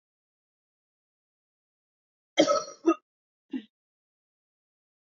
{
  "cough_length": "5.1 s",
  "cough_amplitude": 14734,
  "cough_signal_mean_std_ratio": 0.2,
  "survey_phase": "alpha (2021-03-01 to 2021-08-12)",
  "age": "18-44",
  "gender": "Female",
  "wearing_mask": "No",
  "symptom_cough_any": true,
  "symptom_fatigue": true,
  "symptom_headache": true,
  "symptom_change_to_sense_of_smell_or_taste": true,
  "symptom_loss_of_taste": true,
  "symptom_onset": "5 days",
  "smoker_status": "Never smoked",
  "respiratory_condition_asthma": true,
  "respiratory_condition_other": false,
  "recruitment_source": "Test and Trace",
  "submission_delay": "1 day",
  "covid_test_result": "Positive",
  "covid_test_method": "RT-qPCR",
  "covid_ct_value": 15.4,
  "covid_ct_gene": "ORF1ab gene",
  "covid_ct_mean": 15.8,
  "covid_viral_load": "6800000 copies/ml",
  "covid_viral_load_category": "High viral load (>1M copies/ml)"
}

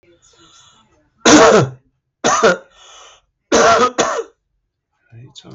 {
  "three_cough_length": "5.5 s",
  "three_cough_amplitude": 32768,
  "three_cough_signal_mean_std_ratio": 0.42,
  "survey_phase": "beta (2021-08-13 to 2022-03-07)",
  "age": "45-64",
  "gender": "Male",
  "wearing_mask": "Yes",
  "symptom_none": true,
  "smoker_status": "Ex-smoker",
  "respiratory_condition_asthma": false,
  "respiratory_condition_other": false,
  "recruitment_source": "REACT",
  "submission_delay": "3 days",
  "covid_test_result": "Negative",
  "covid_test_method": "RT-qPCR",
  "influenza_a_test_result": "Negative",
  "influenza_b_test_result": "Negative"
}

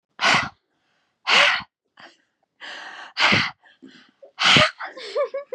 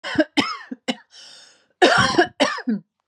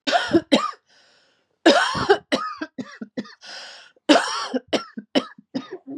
{
  "exhalation_length": "5.5 s",
  "exhalation_amplitude": 25062,
  "exhalation_signal_mean_std_ratio": 0.44,
  "cough_length": "3.1 s",
  "cough_amplitude": 25748,
  "cough_signal_mean_std_ratio": 0.48,
  "three_cough_length": "6.0 s",
  "three_cough_amplitude": 32289,
  "three_cough_signal_mean_std_ratio": 0.44,
  "survey_phase": "beta (2021-08-13 to 2022-03-07)",
  "age": "18-44",
  "gender": "Female",
  "wearing_mask": "No",
  "symptom_none": true,
  "smoker_status": "Never smoked",
  "respiratory_condition_asthma": true,
  "respiratory_condition_other": false,
  "recruitment_source": "REACT",
  "submission_delay": "2 days",
  "covid_test_result": "Negative",
  "covid_test_method": "RT-qPCR",
  "influenza_a_test_result": "Negative",
  "influenza_b_test_result": "Negative"
}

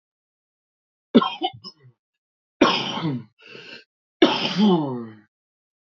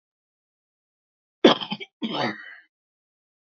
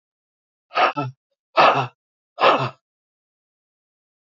{
  "three_cough_length": "6.0 s",
  "three_cough_amplitude": 28269,
  "three_cough_signal_mean_std_ratio": 0.38,
  "cough_length": "3.5 s",
  "cough_amplitude": 27485,
  "cough_signal_mean_std_ratio": 0.24,
  "exhalation_length": "4.4 s",
  "exhalation_amplitude": 26774,
  "exhalation_signal_mean_std_ratio": 0.33,
  "survey_phase": "beta (2021-08-13 to 2022-03-07)",
  "age": "45-64",
  "gender": "Female",
  "wearing_mask": "No",
  "symptom_cough_any": true,
  "symptom_runny_or_blocked_nose": true,
  "symptom_shortness_of_breath": true,
  "symptom_sore_throat": true,
  "symptom_fatigue": true,
  "symptom_fever_high_temperature": true,
  "symptom_headache": true,
  "symptom_change_to_sense_of_smell_or_taste": true,
  "symptom_onset": "6 days",
  "smoker_status": "Current smoker (11 or more cigarettes per day)",
  "respiratory_condition_asthma": true,
  "respiratory_condition_other": true,
  "recruitment_source": "Test and Trace",
  "submission_delay": "2 days",
  "covid_test_result": "Positive",
  "covid_test_method": "ePCR"
}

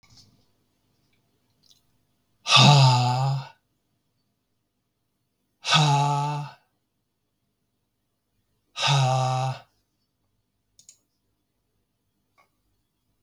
{
  "exhalation_length": "13.2 s",
  "exhalation_amplitude": 28783,
  "exhalation_signal_mean_std_ratio": 0.34,
  "survey_phase": "beta (2021-08-13 to 2022-03-07)",
  "age": "18-44",
  "gender": "Male",
  "wearing_mask": "No",
  "symptom_none": true,
  "symptom_onset": "12 days",
  "smoker_status": "Never smoked",
  "respiratory_condition_asthma": false,
  "respiratory_condition_other": false,
  "recruitment_source": "REACT",
  "submission_delay": "6 days",
  "covid_test_result": "Negative",
  "covid_test_method": "RT-qPCR"
}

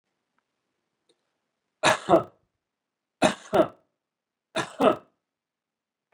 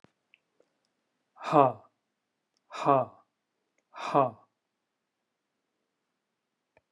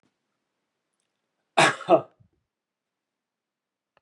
{
  "three_cough_length": "6.1 s",
  "three_cough_amplitude": 19158,
  "three_cough_signal_mean_std_ratio": 0.26,
  "exhalation_length": "6.9 s",
  "exhalation_amplitude": 15675,
  "exhalation_signal_mean_std_ratio": 0.23,
  "cough_length": "4.0 s",
  "cough_amplitude": 18394,
  "cough_signal_mean_std_ratio": 0.2,
  "survey_phase": "beta (2021-08-13 to 2022-03-07)",
  "age": "45-64",
  "gender": "Male",
  "wearing_mask": "No",
  "symptom_none": true,
  "smoker_status": "Never smoked",
  "respiratory_condition_asthma": false,
  "respiratory_condition_other": false,
  "recruitment_source": "REACT",
  "submission_delay": "0 days",
  "covid_test_result": "Negative",
  "covid_test_method": "RT-qPCR"
}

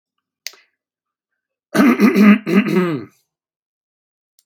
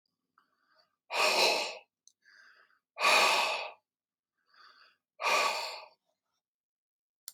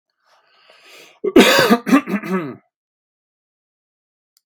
{
  "cough_length": "4.5 s",
  "cough_amplitude": 32767,
  "cough_signal_mean_std_ratio": 0.41,
  "exhalation_length": "7.3 s",
  "exhalation_amplitude": 8441,
  "exhalation_signal_mean_std_ratio": 0.4,
  "three_cough_length": "4.5 s",
  "three_cough_amplitude": 32768,
  "three_cough_signal_mean_std_ratio": 0.34,
  "survey_phase": "beta (2021-08-13 to 2022-03-07)",
  "age": "18-44",
  "gender": "Male",
  "wearing_mask": "No",
  "symptom_cough_any": true,
  "symptom_runny_or_blocked_nose": true,
  "smoker_status": "Ex-smoker",
  "respiratory_condition_asthma": false,
  "respiratory_condition_other": false,
  "recruitment_source": "REACT",
  "submission_delay": "2 days",
  "covid_test_result": "Negative",
  "covid_test_method": "RT-qPCR",
  "influenza_a_test_result": "Negative",
  "influenza_b_test_result": "Negative"
}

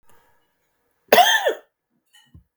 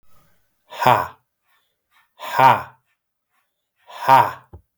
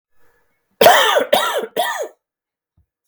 {
  "cough_length": "2.6 s",
  "cough_amplitude": 32768,
  "cough_signal_mean_std_ratio": 0.3,
  "exhalation_length": "4.8 s",
  "exhalation_amplitude": 32768,
  "exhalation_signal_mean_std_ratio": 0.31,
  "three_cough_length": "3.1 s",
  "three_cough_amplitude": 32768,
  "three_cough_signal_mean_std_ratio": 0.44,
  "survey_phase": "beta (2021-08-13 to 2022-03-07)",
  "age": "45-64",
  "gender": "Male",
  "wearing_mask": "No",
  "symptom_cough_any": true,
  "smoker_status": "Never smoked",
  "respiratory_condition_asthma": false,
  "respiratory_condition_other": false,
  "recruitment_source": "REACT",
  "submission_delay": "1 day",
  "covid_test_result": "Negative",
  "covid_test_method": "RT-qPCR",
  "influenza_a_test_result": "Negative",
  "influenza_b_test_result": "Negative"
}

